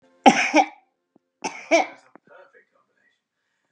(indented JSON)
{
  "cough_length": "3.7 s",
  "cough_amplitude": 32767,
  "cough_signal_mean_std_ratio": 0.29,
  "survey_phase": "beta (2021-08-13 to 2022-03-07)",
  "age": "65+",
  "gender": "Female",
  "wearing_mask": "No",
  "symptom_none": true,
  "smoker_status": "Ex-smoker",
  "respiratory_condition_asthma": false,
  "respiratory_condition_other": false,
  "recruitment_source": "REACT",
  "submission_delay": "1 day",
  "covid_test_result": "Negative",
  "covid_test_method": "RT-qPCR",
  "influenza_a_test_result": "Negative",
  "influenza_b_test_result": "Negative"
}